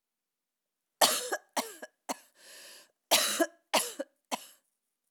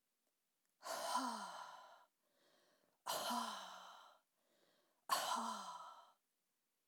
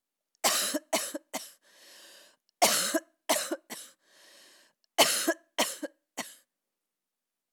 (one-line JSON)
{"cough_length": "5.1 s", "cough_amplitude": 16093, "cough_signal_mean_std_ratio": 0.34, "exhalation_length": "6.9 s", "exhalation_amplitude": 2026, "exhalation_signal_mean_std_ratio": 0.49, "three_cough_length": "7.5 s", "three_cough_amplitude": 16463, "three_cough_signal_mean_std_ratio": 0.38, "survey_phase": "alpha (2021-03-01 to 2021-08-12)", "age": "45-64", "gender": "Female", "wearing_mask": "No", "symptom_none": true, "smoker_status": "Never smoked", "respiratory_condition_asthma": false, "respiratory_condition_other": false, "recruitment_source": "REACT", "submission_delay": "2 days", "covid_test_result": "Negative", "covid_test_method": "RT-qPCR"}